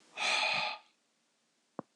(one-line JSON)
{"exhalation_length": "2.0 s", "exhalation_amplitude": 3709, "exhalation_signal_mean_std_ratio": 0.48, "survey_phase": "beta (2021-08-13 to 2022-03-07)", "age": "45-64", "gender": "Male", "wearing_mask": "No", "symptom_none": true, "smoker_status": "Never smoked", "respiratory_condition_asthma": false, "respiratory_condition_other": false, "recruitment_source": "REACT", "submission_delay": "4 days", "covid_test_result": "Negative", "covid_test_method": "RT-qPCR", "influenza_a_test_result": "Negative", "influenza_b_test_result": "Negative"}